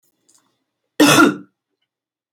{
  "cough_length": "2.3 s",
  "cough_amplitude": 31110,
  "cough_signal_mean_std_ratio": 0.32,
  "survey_phase": "beta (2021-08-13 to 2022-03-07)",
  "age": "45-64",
  "gender": "Female",
  "wearing_mask": "No",
  "symptom_cough_any": true,
  "symptom_onset": "5 days",
  "smoker_status": "Never smoked",
  "respiratory_condition_asthma": false,
  "respiratory_condition_other": false,
  "recruitment_source": "REACT",
  "submission_delay": "2 days",
  "covid_test_result": "Negative",
  "covid_test_method": "RT-qPCR",
  "influenza_a_test_result": "Negative",
  "influenza_b_test_result": "Negative"
}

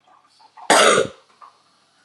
{
  "cough_length": "2.0 s",
  "cough_amplitude": 29168,
  "cough_signal_mean_std_ratio": 0.36,
  "survey_phase": "beta (2021-08-13 to 2022-03-07)",
  "age": "18-44",
  "gender": "Female",
  "wearing_mask": "No",
  "symptom_cough_any": true,
  "symptom_shortness_of_breath": true,
  "symptom_sore_throat": true,
  "symptom_change_to_sense_of_smell_or_taste": true,
  "symptom_loss_of_taste": true,
  "symptom_other": true,
  "symptom_onset": "3 days",
  "smoker_status": "Never smoked",
  "respiratory_condition_asthma": false,
  "respiratory_condition_other": false,
  "recruitment_source": "Test and Trace",
  "submission_delay": "1 day",
  "covid_test_result": "Positive",
  "covid_test_method": "RT-qPCR",
  "covid_ct_value": 21.8,
  "covid_ct_gene": "N gene"
}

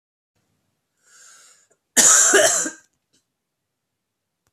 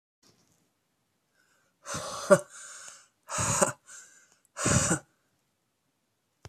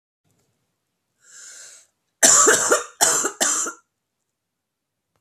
{
  "cough_length": "4.5 s",
  "cough_amplitude": 32733,
  "cough_signal_mean_std_ratio": 0.32,
  "exhalation_length": "6.5 s",
  "exhalation_amplitude": 21336,
  "exhalation_signal_mean_std_ratio": 0.31,
  "three_cough_length": "5.2 s",
  "three_cough_amplitude": 32767,
  "three_cough_signal_mean_std_ratio": 0.37,
  "survey_phase": "beta (2021-08-13 to 2022-03-07)",
  "age": "45-64",
  "gender": "Female",
  "wearing_mask": "No",
  "symptom_cough_any": true,
  "symptom_new_continuous_cough": true,
  "symptom_runny_or_blocked_nose": true,
  "symptom_shortness_of_breath": true,
  "symptom_fatigue": true,
  "symptom_fever_high_temperature": true,
  "symptom_headache": true,
  "symptom_change_to_sense_of_smell_or_taste": true,
  "smoker_status": "Ex-smoker",
  "respiratory_condition_asthma": false,
  "respiratory_condition_other": false,
  "recruitment_source": "Test and Trace",
  "submission_delay": "1 day",
  "covid_test_result": "Positive",
  "covid_test_method": "LFT"
}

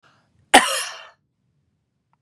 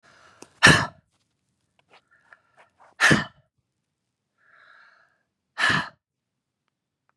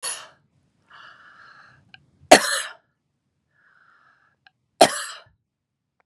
{
  "cough_length": "2.2 s",
  "cough_amplitude": 32768,
  "cough_signal_mean_std_ratio": 0.24,
  "exhalation_length": "7.2 s",
  "exhalation_amplitude": 32705,
  "exhalation_signal_mean_std_ratio": 0.23,
  "three_cough_length": "6.1 s",
  "three_cough_amplitude": 32768,
  "three_cough_signal_mean_std_ratio": 0.19,
  "survey_phase": "beta (2021-08-13 to 2022-03-07)",
  "age": "65+",
  "gender": "Female",
  "wearing_mask": "No",
  "symptom_headache": true,
  "symptom_onset": "8 days",
  "smoker_status": "Never smoked",
  "respiratory_condition_asthma": true,
  "respiratory_condition_other": false,
  "recruitment_source": "REACT",
  "submission_delay": "2 days",
  "covid_test_result": "Negative",
  "covid_test_method": "RT-qPCR",
  "influenza_a_test_result": "Negative",
  "influenza_b_test_result": "Negative"
}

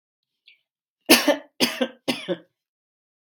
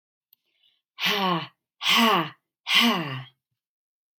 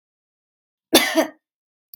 {
  "three_cough_length": "3.3 s",
  "three_cough_amplitude": 32767,
  "three_cough_signal_mean_std_ratio": 0.3,
  "exhalation_length": "4.2 s",
  "exhalation_amplitude": 18982,
  "exhalation_signal_mean_std_ratio": 0.46,
  "cough_length": "2.0 s",
  "cough_amplitude": 32480,
  "cough_signal_mean_std_ratio": 0.28,
  "survey_phase": "beta (2021-08-13 to 2022-03-07)",
  "age": "45-64",
  "gender": "Female",
  "wearing_mask": "No",
  "symptom_none": true,
  "smoker_status": "Never smoked",
  "respiratory_condition_asthma": false,
  "respiratory_condition_other": false,
  "recruitment_source": "REACT",
  "submission_delay": "3 days",
  "covid_test_result": "Negative",
  "covid_test_method": "RT-qPCR",
  "influenza_a_test_result": "Negative",
  "influenza_b_test_result": "Negative"
}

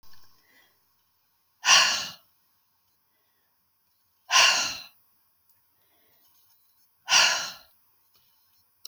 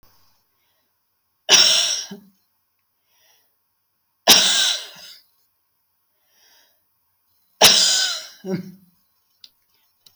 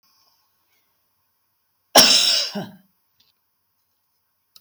{
  "exhalation_length": "8.9 s",
  "exhalation_amplitude": 22115,
  "exhalation_signal_mean_std_ratio": 0.29,
  "three_cough_length": "10.2 s",
  "three_cough_amplitude": 32767,
  "three_cough_signal_mean_std_ratio": 0.32,
  "cough_length": "4.6 s",
  "cough_amplitude": 31403,
  "cough_signal_mean_std_ratio": 0.27,
  "survey_phase": "beta (2021-08-13 to 2022-03-07)",
  "age": "65+",
  "gender": "Female",
  "wearing_mask": "No",
  "symptom_none": true,
  "smoker_status": "Never smoked",
  "respiratory_condition_asthma": false,
  "respiratory_condition_other": false,
  "recruitment_source": "REACT",
  "submission_delay": "2 days",
  "covid_test_result": "Negative",
  "covid_test_method": "RT-qPCR"
}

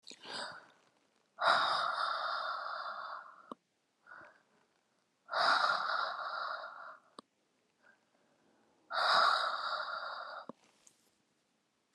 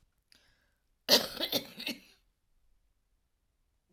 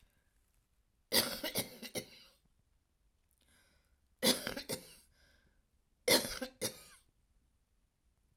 {
  "exhalation_length": "11.9 s",
  "exhalation_amplitude": 5560,
  "exhalation_signal_mean_std_ratio": 0.5,
  "cough_length": "3.9 s",
  "cough_amplitude": 14605,
  "cough_signal_mean_std_ratio": 0.25,
  "three_cough_length": "8.4 s",
  "three_cough_amplitude": 6093,
  "three_cough_signal_mean_std_ratio": 0.29,
  "survey_phase": "alpha (2021-03-01 to 2021-08-12)",
  "age": "45-64",
  "gender": "Female",
  "wearing_mask": "No",
  "symptom_none": true,
  "symptom_onset": "12 days",
  "smoker_status": "Never smoked",
  "respiratory_condition_asthma": true,
  "respiratory_condition_other": true,
  "recruitment_source": "REACT",
  "submission_delay": "1 day",
  "covid_test_result": "Negative",
  "covid_test_method": "RT-qPCR"
}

